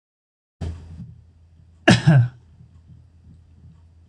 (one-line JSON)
{"cough_length": "4.1 s", "cough_amplitude": 26027, "cough_signal_mean_std_ratio": 0.3, "survey_phase": "beta (2021-08-13 to 2022-03-07)", "age": "65+", "gender": "Male", "wearing_mask": "No", "symptom_none": true, "smoker_status": "Never smoked", "respiratory_condition_asthma": false, "respiratory_condition_other": false, "recruitment_source": "REACT", "submission_delay": "5 days", "covid_test_result": "Negative", "covid_test_method": "RT-qPCR"}